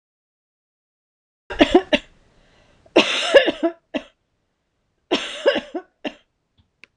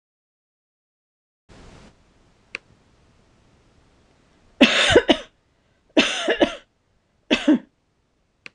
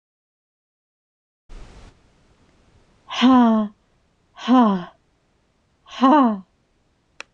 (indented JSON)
{
  "cough_length": "7.0 s",
  "cough_amplitude": 26028,
  "cough_signal_mean_std_ratio": 0.31,
  "three_cough_length": "8.5 s",
  "three_cough_amplitude": 26028,
  "three_cough_signal_mean_std_ratio": 0.28,
  "exhalation_length": "7.3 s",
  "exhalation_amplitude": 22844,
  "exhalation_signal_mean_std_ratio": 0.36,
  "survey_phase": "beta (2021-08-13 to 2022-03-07)",
  "age": "45-64",
  "gender": "Female",
  "wearing_mask": "No",
  "symptom_none": true,
  "smoker_status": "Never smoked",
  "respiratory_condition_asthma": false,
  "respiratory_condition_other": false,
  "recruitment_source": "REACT",
  "submission_delay": "1 day",
  "covid_test_result": "Negative",
  "covid_test_method": "RT-qPCR",
  "influenza_a_test_result": "Unknown/Void",
  "influenza_b_test_result": "Unknown/Void"
}